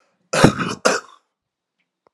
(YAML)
cough_length: 2.1 s
cough_amplitude: 32768
cough_signal_mean_std_ratio: 0.33
survey_phase: alpha (2021-03-01 to 2021-08-12)
age: 45-64
gender: Male
wearing_mask: 'No'
symptom_cough_any: true
symptom_fatigue: true
symptom_headache: true
symptom_onset: 3 days
smoker_status: Never smoked
respiratory_condition_asthma: false
respiratory_condition_other: false
recruitment_source: Test and Trace
submission_delay: 2 days
covid_test_result: Positive
covid_test_method: RT-qPCR
covid_ct_value: 15.8
covid_ct_gene: ORF1ab gene
covid_ct_mean: 16.3
covid_viral_load: 4400000 copies/ml
covid_viral_load_category: High viral load (>1M copies/ml)